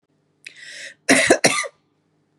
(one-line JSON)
{"cough_length": "2.4 s", "cough_amplitude": 32605, "cough_signal_mean_std_ratio": 0.36, "survey_phase": "beta (2021-08-13 to 2022-03-07)", "age": "45-64", "gender": "Female", "wearing_mask": "No", "symptom_none": true, "smoker_status": "Ex-smoker", "respiratory_condition_asthma": true, "respiratory_condition_other": false, "recruitment_source": "REACT", "submission_delay": "1 day", "covid_test_result": "Negative", "covid_test_method": "RT-qPCR", "influenza_a_test_result": "Negative", "influenza_b_test_result": "Negative"}